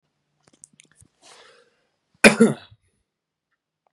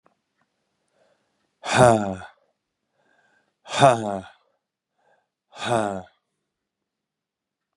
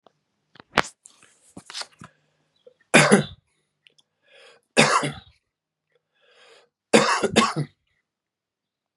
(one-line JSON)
{"cough_length": "3.9 s", "cough_amplitude": 32768, "cough_signal_mean_std_ratio": 0.18, "exhalation_length": "7.8 s", "exhalation_amplitude": 29400, "exhalation_signal_mean_std_ratio": 0.27, "three_cough_length": "9.0 s", "three_cough_amplitude": 32768, "three_cough_signal_mean_std_ratio": 0.28, "survey_phase": "beta (2021-08-13 to 2022-03-07)", "age": "18-44", "gender": "Male", "wearing_mask": "No", "symptom_cough_any": true, "symptom_runny_or_blocked_nose": true, "symptom_sore_throat": true, "symptom_headache": true, "symptom_change_to_sense_of_smell_or_taste": true, "symptom_loss_of_taste": true, "symptom_onset": "5 days", "smoker_status": "Never smoked", "respiratory_condition_asthma": false, "respiratory_condition_other": false, "recruitment_source": "Test and Trace", "submission_delay": "2 days", "covid_test_result": "Positive", "covid_test_method": "RT-qPCR", "covid_ct_value": 20.6, "covid_ct_gene": "ORF1ab gene"}